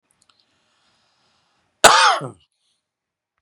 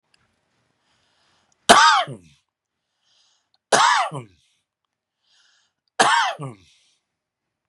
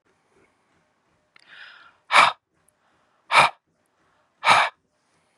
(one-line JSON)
{"cough_length": "3.4 s", "cough_amplitude": 32768, "cough_signal_mean_std_ratio": 0.25, "three_cough_length": "7.7 s", "three_cough_amplitude": 32768, "three_cough_signal_mean_std_ratio": 0.3, "exhalation_length": "5.4 s", "exhalation_amplitude": 27875, "exhalation_signal_mean_std_ratio": 0.27, "survey_phase": "beta (2021-08-13 to 2022-03-07)", "age": "45-64", "gender": "Male", "wearing_mask": "No", "symptom_none": true, "smoker_status": "Ex-smoker", "respiratory_condition_asthma": false, "respiratory_condition_other": false, "recruitment_source": "REACT", "submission_delay": "2 days", "covid_test_result": "Negative", "covid_test_method": "RT-qPCR", "influenza_a_test_result": "Negative", "influenza_b_test_result": "Negative"}